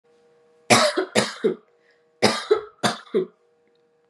{"cough_length": "4.1 s", "cough_amplitude": 29606, "cough_signal_mean_std_ratio": 0.4, "survey_phase": "beta (2021-08-13 to 2022-03-07)", "age": "18-44", "gender": "Female", "wearing_mask": "No", "symptom_none": true, "symptom_onset": "8 days", "smoker_status": "Never smoked", "respiratory_condition_asthma": false, "respiratory_condition_other": false, "recruitment_source": "REACT", "submission_delay": "1 day", "covid_test_result": "Negative", "covid_test_method": "RT-qPCR", "influenza_a_test_result": "Negative", "influenza_b_test_result": "Negative"}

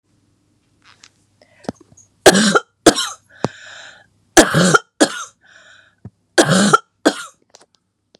{"three_cough_length": "8.2 s", "three_cough_amplitude": 32768, "three_cough_signal_mean_std_ratio": 0.33, "survey_phase": "beta (2021-08-13 to 2022-03-07)", "age": "45-64", "gender": "Female", "wearing_mask": "No", "symptom_cough_any": true, "symptom_runny_or_blocked_nose": true, "symptom_sore_throat": true, "symptom_abdominal_pain": true, "symptom_diarrhoea": true, "symptom_fatigue": true, "symptom_headache": true, "symptom_change_to_sense_of_smell_or_taste": true, "symptom_loss_of_taste": true, "symptom_other": true, "symptom_onset": "3 days", "smoker_status": "Never smoked", "respiratory_condition_asthma": false, "respiratory_condition_other": false, "recruitment_source": "Test and Trace", "submission_delay": "1 day", "covid_test_result": "Positive", "covid_test_method": "RT-qPCR", "covid_ct_value": 23.3, "covid_ct_gene": "ORF1ab gene", "covid_ct_mean": 23.7, "covid_viral_load": "17000 copies/ml", "covid_viral_load_category": "Low viral load (10K-1M copies/ml)"}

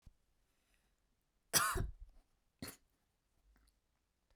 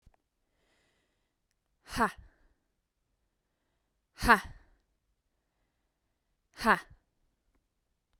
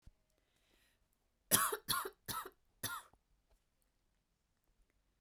{"cough_length": "4.4 s", "cough_amplitude": 5143, "cough_signal_mean_std_ratio": 0.25, "exhalation_length": "8.2 s", "exhalation_amplitude": 16845, "exhalation_signal_mean_std_ratio": 0.17, "three_cough_length": "5.2 s", "three_cough_amplitude": 7672, "three_cough_signal_mean_std_ratio": 0.27, "survey_phase": "beta (2021-08-13 to 2022-03-07)", "age": "18-44", "gender": "Female", "wearing_mask": "No", "symptom_shortness_of_breath": true, "symptom_fatigue": true, "symptom_headache": true, "symptom_onset": "12 days", "smoker_status": "Never smoked", "respiratory_condition_asthma": false, "respiratory_condition_other": false, "recruitment_source": "REACT", "submission_delay": "0 days", "covid_test_result": "Negative", "covid_test_method": "RT-qPCR"}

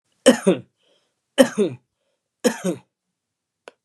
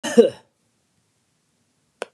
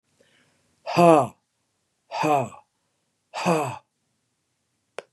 {"three_cough_length": "3.8 s", "three_cough_amplitude": 32768, "three_cough_signal_mean_std_ratio": 0.29, "cough_length": "2.1 s", "cough_amplitude": 32030, "cough_signal_mean_std_ratio": 0.22, "exhalation_length": "5.1 s", "exhalation_amplitude": 23804, "exhalation_signal_mean_std_ratio": 0.31, "survey_phase": "beta (2021-08-13 to 2022-03-07)", "age": "65+", "gender": "Male", "wearing_mask": "No", "symptom_none": true, "smoker_status": "Ex-smoker", "respiratory_condition_asthma": false, "respiratory_condition_other": false, "recruitment_source": "REACT", "submission_delay": "4 days", "covid_test_result": "Negative", "covid_test_method": "RT-qPCR", "influenza_a_test_result": "Negative", "influenza_b_test_result": "Negative"}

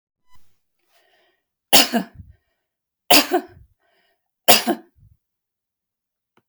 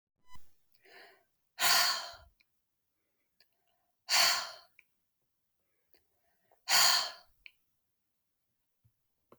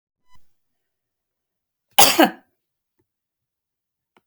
{"three_cough_length": "6.5 s", "three_cough_amplitude": 32768, "three_cough_signal_mean_std_ratio": 0.24, "exhalation_length": "9.4 s", "exhalation_amplitude": 7738, "exhalation_signal_mean_std_ratio": 0.3, "cough_length": "4.3 s", "cough_amplitude": 32768, "cough_signal_mean_std_ratio": 0.2, "survey_phase": "beta (2021-08-13 to 2022-03-07)", "age": "65+", "gender": "Female", "wearing_mask": "No", "symptom_cough_any": true, "smoker_status": "Never smoked", "respiratory_condition_asthma": true, "respiratory_condition_other": false, "recruitment_source": "REACT", "submission_delay": "1 day", "covid_test_result": "Negative", "covid_test_method": "RT-qPCR", "influenza_a_test_result": "Negative", "influenza_b_test_result": "Negative"}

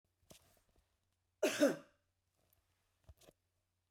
{"cough_length": "3.9 s", "cough_amplitude": 3350, "cough_signal_mean_std_ratio": 0.22, "survey_phase": "beta (2021-08-13 to 2022-03-07)", "age": "65+", "gender": "Female", "wearing_mask": "No", "symptom_none": true, "smoker_status": "Never smoked", "respiratory_condition_asthma": false, "respiratory_condition_other": true, "recruitment_source": "REACT", "submission_delay": "0 days", "covid_test_result": "Negative", "covid_test_method": "RT-qPCR"}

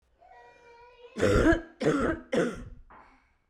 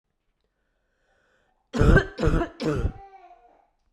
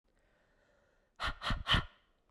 {"three_cough_length": "3.5 s", "three_cough_amplitude": 9316, "three_cough_signal_mean_std_ratio": 0.48, "cough_length": "3.9 s", "cough_amplitude": 19408, "cough_signal_mean_std_ratio": 0.36, "exhalation_length": "2.3 s", "exhalation_amplitude": 5171, "exhalation_signal_mean_std_ratio": 0.36, "survey_phase": "beta (2021-08-13 to 2022-03-07)", "age": "18-44", "gender": "Female", "wearing_mask": "No", "symptom_cough_any": true, "symptom_runny_or_blocked_nose": true, "symptom_headache": true, "symptom_change_to_sense_of_smell_or_taste": true, "symptom_onset": "3 days", "smoker_status": "Never smoked", "respiratory_condition_asthma": false, "respiratory_condition_other": false, "recruitment_source": "Test and Trace", "submission_delay": "1 day", "covid_test_result": "Positive", "covid_test_method": "RT-qPCR", "covid_ct_value": 23.1, "covid_ct_gene": "ORF1ab gene"}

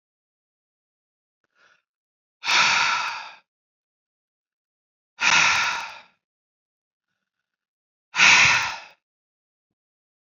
{"exhalation_length": "10.3 s", "exhalation_amplitude": 25763, "exhalation_signal_mean_std_ratio": 0.33, "survey_phase": "beta (2021-08-13 to 2022-03-07)", "age": "45-64", "gender": "Female", "wearing_mask": "No", "symptom_runny_or_blocked_nose": true, "symptom_headache": true, "symptom_change_to_sense_of_smell_or_taste": true, "symptom_loss_of_taste": true, "symptom_onset": "4 days", "smoker_status": "Never smoked", "respiratory_condition_asthma": false, "respiratory_condition_other": false, "recruitment_source": "Test and Trace", "submission_delay": "1 day", "covid_test_result": "Positive", "covid_test_method": "RT-qPCR"}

